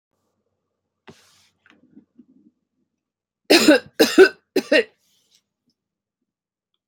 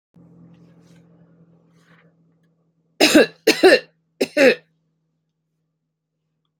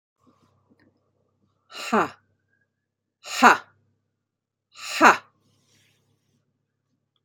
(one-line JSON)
{"three_cough_length": "6.9 s", "three_cough_amplitude": 29618, "three_cough_signal_mean_std_ratio": 0.24, "cough_length": "6.6 s", "cough_amplitude": 28411, "cough_signal_mean_std_ratio": 0.27, "exhalation_length": "7.2 s", "exhalation_amplitude": 29120, "exhalation_signal_mean_std_ratio": 0.21, "survey_phase": "alpha (2021-03-01 to 2021-08-12)", "age": "45-64", "gender": "Female", "wearing_mask": "No", "symptom_none": true, "symptom_onset": "4 days", "smoker_status": "Never smoked", "respiratory_condition_asthma": false, "respiratory_condition_other": false, "recruitment_source": "REACT", "submission_delay": "1 day", "covid_test_result": "Negative", "covid_test_method": "RT-qPCR"}